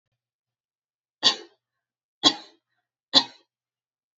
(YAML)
three_cough_length: 4.2 s
three_cough_amplitude: 27907
three_cough_signal_mean_std_ratio: 0.19
survey_phase: alpha (2021-03-01 to 2021-08-12)
age: 45-64
gender: Female
wearing_mask: 'No'
symptom_none: true
smoker_status: Never smoked
respiratory_condition_asthma: false
respiratory_condition_other: false
recruitment_source: REACT
submission_delay: 2 days
covid_test_result: Negative
covid_test_method: RT-qPCR